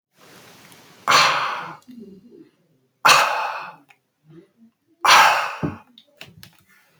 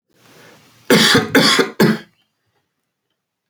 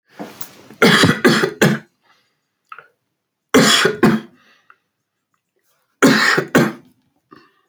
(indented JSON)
{
  "exhalation_length": "7.0 s",
  "exhalation_amplitude": 29671,
  "exhalation_signal_mean_std_ratio": 0.38,
  "cough_length": "3.5 s",
  "cough_amplitude": 32767,
  "cough_signal_mean_std_ratio": 0.42,
  "three_cough_length": "7.7 s",
  "three_cough_amplitude": 32767,
  "three_cough_signal_mean_std_ratio": 0.43,
  "survey_phase": "alpha (2021-03-01 to 2021-08-12)",
  "age": "18-44",
  "gender": "Male",
  "wearing_mask": "No",
  "symptom_none": true,
  "smoker_status": "Never smoked",
  "respiratory_condition_asthma": false,
  "respiratory_condition_other": false,
  "recruitment_source": "REACT",
  "submission_delay": "3 days",
  "covid_test_result": "Negative",
  "covid_test_method": "RT-qPCR"
}